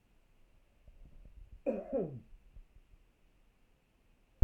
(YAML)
cough_length: 4.4 s
cough_amplitude: 9756
cough_signal_mean_std_ratio: 0.21
survey_phase: beta (2021-08-13 to 2022-03-07)
age: 65+
gender: Male
wearing_mask: 'No'
symptom_none: true
smoker_status: Ex-smoker
respiratory_condition_asthma: false
respiratory_condition_other: false
recruitment_source: REACT
submission_delay: 2 days
covid_test_result: Negative
covid_test_method: RT-qPCR